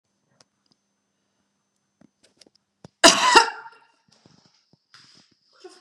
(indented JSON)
{
  "cough_length": "5.8 s",
  "cough_amplitude": 32767,
  "cough_signal_mean_std_ratio": 0.2,
  "survey_phase": "beta (2021-08-13 to 2022-03-07)",
  "age": "45-64",
  "gender": "Female",
  "wearing_mask": "No",
  "symptom_none": true,
  "smoker_status": "Never smoked",
  "respiratory_condition_asthma": false,
  "respiratory_condition_other": false,
  "recruitment_source": "REACT",
  "submission_delay": "1 day",
  "covid_test_result": "Negative",
  "covid_test_method": "RT-qPCR"
}